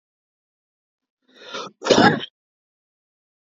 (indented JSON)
{
  "cough_length": "3.4 s",
  "cough_amplitude": 28014,
  "cough_signal_mean_std_ratio": 0.26,
  "survey_phase": "beta (2021-08-13 to 2022-03-07)",
  "age": "18-44",
  "gender": "Male",
  "wearing_mask": "No",
  "symptom_cough_any": true,
  "symptom_new_continuous_cough": true,
  "symptom_runny_or_blocked_nose": true,
  "symptom_shortness_of_breath": true,
  "symptom_sore_throat": true,
  "symptom_fatigue": true,
  "symptom_headache": true,
  "symptom_onset": "4 days",
  "smoker_status": "Never smoked",
  "respiratory_condition_asthma": true,
  "respiratory_condition_other": false,
  "recruitment_source": "Test and Trace",
  "submission_delay": "1 day",
  "covid_test_result": "Positive",
  "covid_test_method": "RT-qPCR",
  "covid_ct_value": 25.3,
  "covid_ct_gene": "ORF1ab gene"
}